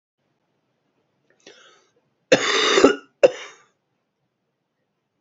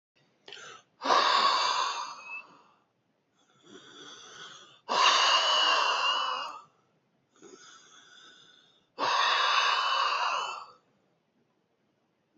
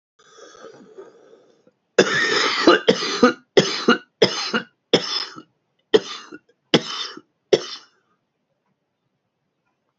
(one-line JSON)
{"cough_length": "5.2 s", "cough_amplitude": 28141, "cough_signal_mean_std_ratio": 0.27, "exhalation_length": "12.4 s", "exhalation_amplitude": 10726, "exhalation_signal_mean_std_ratio": 0.53, "three_cough_length": "10.0 s", "three_cough_amplitude": 31984, "three_cough_signal_mean_std_ratio": 0.36, "survey_phase": "beta (2021-08-13 to 2022-03-07)", "age": "45-64", "gender": "Male", "wearing_mask": "No", "symptom_cough_any": true, "symptom_new_continuous_cough": true, "symptom_runny_or_blocked_nose": true, "symptom_shortness_of_breath": true, "symptom_fatigue": true, "symptom_fever_high_temperature": true, "symptom_headache": true, "symptom_onset": "5 days", "smoker_status": "Ex-smoker", "respiratory_condition_asthma": false, "respiratory_condition_other": false, "recruitment_source": "Test and Trace", "submission_delay": "2 days", "covid_test_result": "Positive", "covid_test_method": "RT-qPCR", "covid_ct_value": 24.4, "covid_ct_gene": "S gene", "covid_ct_mean": 24.7, "covid_viral_load": "7700 copies/ml", "covid_viral_load_category": "Minimal viral load (< 10K copies/ml)"}